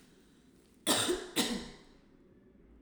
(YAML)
cough_length: 2.8 s
cough_amplitude: 6547
cough_signal_mean_std_ratio: 0.43
survey_phase: alpha (2021-03-01 to 2021-08-12)
age: 18-44
gender: Female
wearing_mask: 'Yes'
symptom_none: true
smoker_status: Never smoked
respiratory_condition_asthma: false
respiratory_condition_other: false
recruitment_source: REACT
submission_delay: 2 days
covid_test_result: Negative
covid_test_method: RT-qPCR